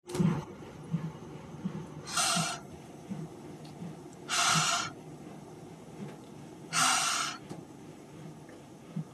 {"exhalation_length": "9.1 s", "exhalation_amplitude": 6692, "exhalation_signal_mean_std_ratio": 0.61, "survey_phase": "beta (2021-08-13 to 2022-03-07)", "age": "18-44", "gender": "Female", "wearing_mask": "No", "symptom_none": true, "smoker_status": "Never smoked", "respiratory_condition_asthma": false, "respiratory_condition_other": false, "recruitment_source": "REACT", "submission_delay": "1 day", "covid_test_result": "Negative", "covid_test_method": "RT-qPCR", "influenza_a_test_result": "Unknown/Void", "influenza_b_test_result": "Unknown/Void"}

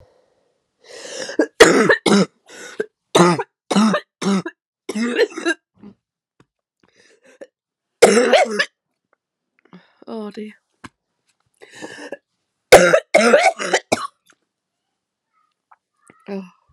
{"three_cough_length": "16.7 s", "three_cough_amplitude": 32768, "three_cough_signal_mean_std_ratio": 0.36, "survey_phase": "alpha (2021-03-01 to 2021-08-12)", "age": "18-44", "gender": "Female", "wearing_mask": "No", "symptom_cough_any": true, "symptom_fatigue": true, "symptom_fever_high_temperature": true, "symptom_headache": true, "smoker_status": "Ex-smoker", "respiratory_condition_asthma": false, "respiratory_condition_other": false, "recruitment_source": "Test and Trace", "submission_delay": "1 day", "covid_test_result": "Positive", "covid_test_method": "RT-qPCR", "covid_ct_value": 12.3, "covid_ct_gene": "ORF1ab gene", "covid_ct_mean": 12.8, "covid_viral_load": "64000000 copies/ml", "covid_viral_load_category": "High viral load (>1M copies/ml)"}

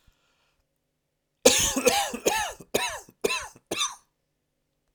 {"three_cough_length": "4.9 s", "three_cough_amplitude": 31799, "three_cough_signal_mean_std_ratio": 0.4, "survey_phase": "beta (2021-08-13 to 2022-03-07)", "age": "18-44", "gender": "Male", "wearing_mask": "No", "symptom_cough_any": true, "symptom_fatigue": true, "symptom_headache": true, "symptom_onset": "3 days", "smoker_status": "Never smoked", "respiratory_condition_asthma": true, "respiratory_condition_other": false, "recruitment_source": "REACT", "submission_delay": "1 day", "covid_test_result": "Negative", "covid_test_method": "RT-qPCR"}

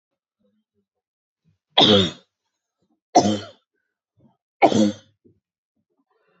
{"three_cough_length": "6.4 s", "three_cough_amplitude": 32768, "three_cough_signal_mean_std_ratio": 0.28, "survey_phase": "beta (2021-08-13 to 2022-03-07)", "age": "18-44", "gender": "Female", "wearing_mask": "No", "symptom_none": true, "smoker_status": "Never smoked", "respiratory_condition_asthma": false, "respiratory_condition_other": false, "recruitment_source": "REACT", "submission_delay": "1 day", "covid_test_result": "Negative", "covid_test_method": "RT-qPCR"}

